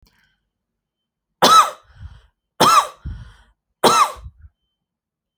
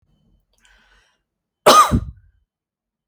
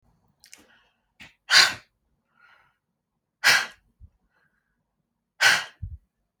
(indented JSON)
{
  "three_cough_length": "5.4 s",
  "three_cough_amplitude": 31557,
  "three_cough_signal_mean_std_ratio": 0.33,
  "cough_length": "3.1 s",
  "cough_amplitude": 32502,
  "cough_signal_mean_std_ratio": 0.26,
  "exhalation_length": "6.4 s",
  "exhalation_amplitude": 25720,
  "exhalation_signal_mean_std_ratio": 0.25,
  "survey_phase": "alpha (2021-03-01 to 2021-08-12)",
  "age": "18-44",
  "gender": "Female",
  "wearing_mask": "No",
  "symptom_none": true,
  "smoker_status": "Never smoked",
  "respiratory_condition_asthma": false,
  "respiratory_condition_other": false,
  "recruitment_source": "REACT",
  "submission_delay": "1 day",
  "covid_test_result": "Negative",
  "covid_test_method": "RT-qPCR"
}